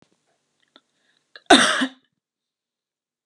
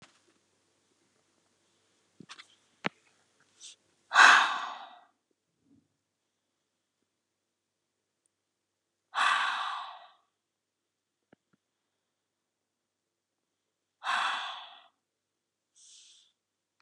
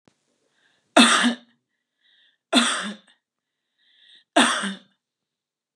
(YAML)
cough_length: 3.3 s
cough_amplitude: 32767
cough_signal_mean_std_ratio: 0.23
exhalation_length: 16.8 s
exhalation_amplitude: 23597
exhalation_signal_mean_std_ratio: 0.21
three_cough_length: 5.8 s
three_cough_amplitude: 31459
three_cough_signal_mean_std_ratio: 0.32
survey_phase: beta (2021-08-13 to 2022-03-07)
age: 45-64
gender: Female
wearing_mask: 'No'
symptom_none: true
smoker_status: Ex-smoker
respiratory_condition_asthma: false
respiratory_condition_other: false
recruitment_source: REACT
submission_delay: 3 days
covid_test_result: Negative
covid_test_method: RT-qPCR
influenza_a_test_result: Negative
influenza_b_test_result: Negative